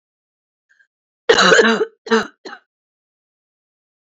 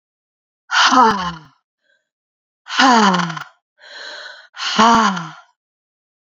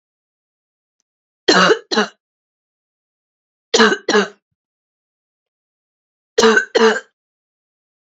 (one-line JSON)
{"cough_length": "4.0 s", "cough_amplitude": 31078, "cough_signal_mean_std_ratio": 0.33, "exhalation_length": "6.4 s", "exhalation_amplitude": 30250, "exhalation_signal_mean_std_ratio": 0.44, "three_cough_length": "8.1 s", "three_cough_amplitude": 32768, "three_cough_signal_mean_std_ratio": 0.32, "survey_phase": "beta (2021-08-13 to 2022-03-07)", "age": "45-64", "gender": "Female", "wearing_mask": "No", "symptom_cough_any": true, "symptom_runny_or_blocked_nose": true, "symptom_sore_throat": true, "symptom_fatigue": true, "symptom_fever_high_temperature": true, "symptom_headache": true, "symptom_change_to_sense_of_smell_or_taste": true, "symptom_loss_of_taste": true, "symptom_onset": "4 days", "smoker_status": "Never smoked", "respiratory_condition_asthma": false, "respiratory_condition_other": false, "recruitment_source": "Test and Trace", "submission_delay": "1 day", "covid_test_result": "Positive", "covid_test_method": "RT-qPCR", "covid_ct_value": 20.4, "covid_ct_gene": "N gene"}